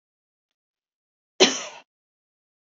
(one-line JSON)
{"cough_length": "2.7 s", "cough_amplitude": 25480, "cough_signal_mean_std_ratio": 0.18, "survey_phase": "beta (2021-08-13 to 2022-03-07)", "age": "45-64", "gender": "Female", "wearing_mask": "No", "symptom_none": true, "smoker_status": "Ex-smoker", "respiratory_condition_asthma": false, "respiratory_condition_other": false, "recruitment_source": "REACT", "submission_delay": "2 days", "covid_test_result": "Negative", "covid_test_method": "RT-qPCR", "influenza_a_test_result": "Negative", "influenza_b_test_result": "Negative"}